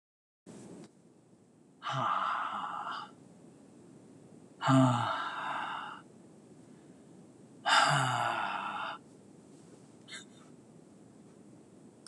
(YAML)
exhalation_length: 12.1 s
exhalation_amplitude: 8581
exhalation_signal_mean_std_ratio: 0.46
survey_phase: alpha (2021-03-01 to 2021-08-12)
age: 45-64
gender: Male
wearing_mask: 'No'
symptom_none: true
smoker_status: Never smoked
respiratory_condition_asthma: false
respiratory_condition_other: false
recruitment_source: REACT
submission_delay: 1 day
covid_test_result: Negative
covid_test_method: RT-qPCR